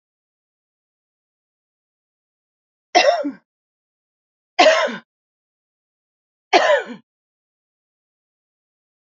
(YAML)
three_cough_length: 9.1 s
three_cough_amplitude: 29670
three_cough_signal_mean_std_ratio: 0.25
survey_phase: alpha (2021-03-01 to 2021-08-12)
age: 65+
gender: Female
wearing_mask: 'No'
symptom_none: true
smoker_status: Never smoked
respiratory_condition_asthma: false
respiratory_condition_other: false
recruitment_source: REACT
submission_delay: 2 days
covid_test_result: Negative
covid_test_method: RT-qPCR